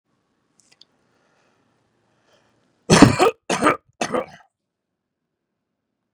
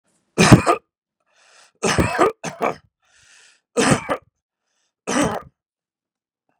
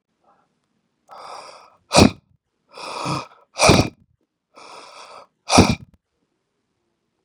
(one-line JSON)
{"cough_length": "6.1 s", "cough_amplitude": 32768, "cough_signal_mean_std_ratio": 0.24, "three_cough_length": "6.6 s", "three_cough_amplitude": 32768, "three_cough_signal_mean_std_ratio": 0.33, "exhalation_length": "7.2 s", "exhalation_amplitude": 32768, "exhalation_signal_mean_std_ratio": 0.27, "survey_phase": "beta (2021-08-13 to 2022-03-07)", "age": "45-64", "gender": "Male", "wearing_mask": "No", "symptom_cough_any": true, "smoker_status": "Ex-smoker", "respiratory_condition_asthma": false, "respiratory_condition_other": false, "recruitment_source": "REACT", "submission_delay": "2 days", "covid_test_result": "Negative", "covid_test_method": "RT-qPCR", "influenza_a_test_result": "Unknown/Void", "influenza_b_test_result": "Unknown/Void"}